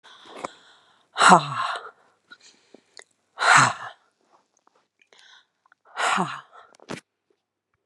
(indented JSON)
{
  "exhalation_length": "7.9 s",
  "exhalation_amplitude": 32767,
  "exhalation_signal_mean_std_ratio": 0.29,
  "survey_phase": "beta (2021-08-13 to 2022-03-07)",
  "age": "65+",
  "gender": "Female",
  "wearing_mask": "No",
  "symptom_none": true,
  "smoker_status": "Never smoked",
  "respiratory_condition_asthma": false,
  "respiratory_condition_other": false,
  "recruitment_source": "REACT",
  "submission_delay": "2 days",
  "covid_test_result": "Negative",
  "covid_test_method": "RT-qPCR",
  "influenza_a_test_result": "Negative",
  "influenza_b_test_result": "Negative"
}